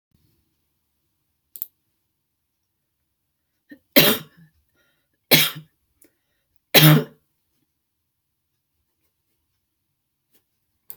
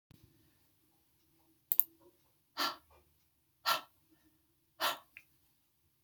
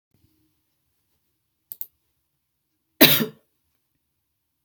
{"three_cough_length": "11.0 s", "three_cough_amplitude": 32768, "three_cough_signal_mean_std_ratio": 0.19, "exhalation_length": "6.0 s", "exhalation_amplitude": 22269, "exhalation_signal_mean_std_ratio": 0.21, "cough_length": "4.6 s", "cough_amplitude": 32768, "cough_signal_mean_std_ratio": 0.17, "survey_phase": "beta (2021-08-13 to 2022-03-07)", "age": "65+", "gender": "Female", "wearing_mask": "No", "symptom_none": true, "smoker_status": "Never smoked", "respiratory_condition_asthma": false, "respiratory_condition_other": false, "recruitment_source": "REACT", "submission_delay": "2 days", "covid_test_result": "Negative", "covid_test_method": "RT-qPCR"}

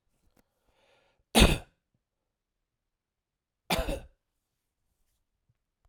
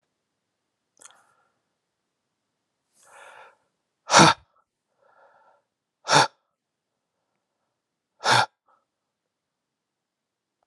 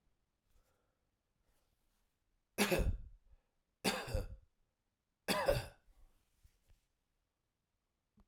{"cough_length": "5.9 s", "cough_amplitude": 15231, "cough_signal_mean_std_ratio": 0.19, "exhalation_length": "10.7 s", "exhalation_amplitude": 30009, "exhalation_signal_mean_std_ratio": 0.18, "three_cough_length": "8.3 s", "three_cough_amplitude": 3893, "three_cough_signal_mean_std_ratio": 0.3, "survey_phase": "alpha (2021-03-01 to 2021-08-12)", "age": "45-64", "gender": "Male", "wearing_mask": "No", "symptom_none": true, "smoker_status": "Ex-smoker", "respiratory_condition_asthma": false, "respiratory_condition_other": false, "recruitment_source": "REACT", "submission_delay": "2 days", "covid_test_result": "Negative", "covid_test_method": "RT-qPCR"}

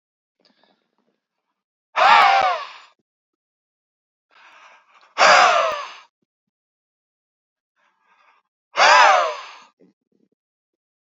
{"exhalation_length": "11.2 s", "exhalation_amplitude": 31627, "exhalation_signal_mean_std_ratio": 0.32, "survey_phase": "beta (2021-08-13 to 2022-03-07)", "age": "45-64", "gender": "Male", "wearing_mask": "No", "symptom_shortness_of_breath": true, "symptom_fatigue": true, "symptom_headache": true, "symptom_other": true, "smoker_status": "Never smoked", "respiratory_condition_asthma": false, "respiratory_condition_other": false, "recruitment_source": "Test and Trace", "submission_delay": "2 days", "covid_test_result": "Positive", "covid_test_method": "RT-qPCR", "covid_ct_value": 31.6, "covid_ct_gene": "N gene", "covid_ct_mean": 31.7, "covid_viral_load": "39 copies/ml", "covid_viral_load_category": "Minimal viral load (< 10K copies/ml)"}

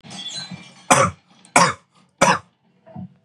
{"three_cough_length": "3.2 s", "three_cough_amplitude": 32767, "three_cough_signal_mean_std_ratio": 0.37, "survey_phase": "beta (2021-08-13 to 2022-03-07)", "age": "18-44", "gender": "Male", "wearing_mask": "No", "symptom_none": true, "smoker_status": "Never smoked", "respiratory_condition_asthma": true, "respiratory_condition_other": false, "recruitment_source": "REACT", "submission_delay": "4 days", "covid_test_result": "Negative", "covid_test_method": "RT-qPCR", "influenza_a_test_result": "Negative", "influenza_b_test_result": "Negative"}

